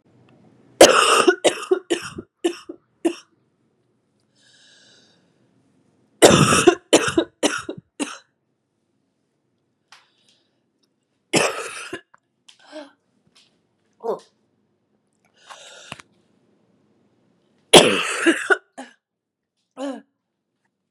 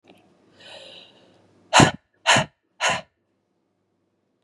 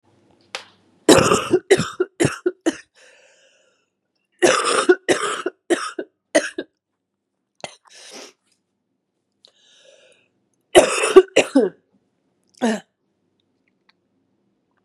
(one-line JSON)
{"three_cough_length": "20.9 s", "three_cough_amplitude": 32768, "three_cough_signal_mean_std_ratio": 0.28, "exhalation_length": "4.4 s", "exhalation_amplitude": 30361, "exhalation_signal_mean_std_ratio": 0.27, "cough_length": "14.8 s", "cough_amplitude": 32768, "cough_signal_mean_std_ratio": 0.31, "survey_phase": "beta (2021-08-13 to 2022-03-07)", "age": "18-44", "gender": "Female", "wearing_mask": "No", "symptom_cough_any": true, "symptom_new_continuous_cough": true, "symptom_fatigue": true, "symptom_headache": true, "symptom_onset": "9 days", "smoker_status": "Never smoked", "respiratory_condition_asthma": false, "respiratory_condition_other": false, "recruitment_source": "Test and Trace", "submission_delay": "1 day", "covid_test_result": "Positive", "covid_test_method": "RT-qPCR"}